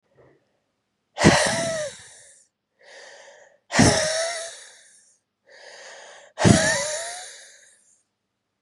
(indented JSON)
{
  "exhalation_length": "8.6 s",
  "exhalation_amplitude": 31785,
  "exhalation_signal_mean_std_ratio": 0.38,
  "survey_phase": "beta (2021-08-13 to 2022-03-07)",
  "age": "18-44",
  "gender": "Female",
  "wearing_mask": "No",
  "symptom_cough_any": true,
  "symptom_runny_or_blocked_nose": true,
  "symptom_sore_throat": true,
  "symptom_onset": "6 days",
  "smoker_status": "Never smoked",
  "respiratory_condition_asthma": false,
  "respiratory_condition_other": false,
  "recruitment_source": "Test and Trace",
  "submission_delay": "2 days",
  "covid_test_result": "Positive",
  "covid_test_method": "RT-qPCR",
  "covid_ct_value": 11.8,
  "covid_ct_gene": "ORF1ab gene",
  "covid_ct_mean": 11.9,
  "covid_viral_load": "120000000 copies/ml",
  "covid_viral_load_category": "High viral load (>1M copies/ml)"
}